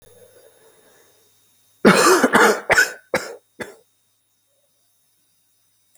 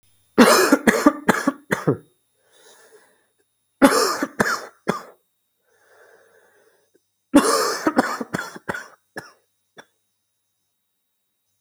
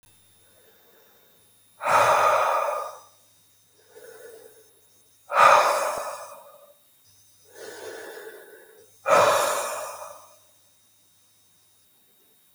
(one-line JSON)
{"cough_length": "6.0 s", "cough_amplitude": 29614, "cough_signal_mean_std_ratio": 0.33, "three_cough_length": "11.6 s", "three_cough_amplitude": 32768, "three_cough_signal_mean_std_ratio": 0.34, "exhalation_length": "12.5 s", "exhalation_amplitude": 25288, "exhalation_signal_mean_std_ratio": 0.39, "survey_phase": "alpha (2021-03-01 to 2021-08-12)", "age": "18-44", "gender": "Male", "wearing_mask": "No", "symptom_cough_any": true, "symptom_fatigue": true, "symptom_change_to_sense_of_smell_or_taste": true, "symptom_loss_of_taste": true, "smoker_status": "Never smoked", "respiratory_condition_asthma": false, "respiratory_condition_other": false, "recruitment_source": "Test and Trace", "submission_delay": "1 day", "covid_test_result": "Positive", "covid_test_method": "RT-qPCR", "covid_ct_value": 15.3, "covid_ct_gene": "S gene", "covid_ct_mean": 15.7, "covid_viral_load": "7400000 copies/ml", "covid_viral_load_category": "High viral load (>1M copies/ml)"}